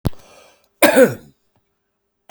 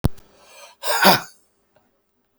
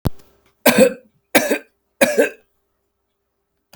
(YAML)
cough_length: 2.3 s
cough_amplitude: 32768
cough_signal_mean_std_ratio: 0.31
exhalation_length: 2.4 s
exhalation_amplitude: 31176
exhalation_signal_mean_std_ratio: 0.33
three_cough_length: 3.8 s
three_cough_amplitude: 32768
three_cough_signal_mean_std_ratio: 0.35
survey_phase: beta (2021-08-13 to 2022-03-07)
age: 45-64
gender: Male
wearing_mask: 'Yes'
symptom_runny_or_blocked_nose: true
symptom_sore_throat: true
symptom_abdominal_pain: true
symptom_onset: 6 days
smoker_status: Ex-smoker
respiratory_condition_asthma: false
respiratory_condition_other: false
recruitment_source: REACT
submission_delay: 21 days
covid_test_result: Negative
covid_test_method: RT-qPCR
influenza_a_test_result: Negative
influenza_b_test_result: Negative